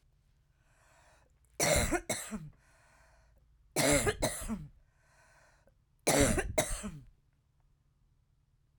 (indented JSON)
{
  "three_cough_length": "8.8 s",
  "three_cough_amplitude": 8383,
  "three_cough_signal_mean_std_ratio": 0.4,
  "survey_phase": "beta (2021-08-13 to 2022-03-07)",
  "age": "45-64",
  "gender": "Female",
  "wearing_mask": "No",
  "symptom_cough_any": true,
  "symptom_runny_or_blocked_nose": true,
  "symptom_sore_throat": true,
  "symptom_fatigue": true,
  "symptom_headache": true,
  "symptom_other": true,
  "symptom_onset": "2 days",
  "smoker_status": "Current smoker (11 or more cigarettes per day)",
  "respiratory_condition_asthma": false,
  "respiratory_condition_other": false,
  "recruitment_source": "Test and Trace",
  "submission_delay": "1 day",
  "covid_test_result": "Negative",
  "covid_test_method": "RT-qPCR"
}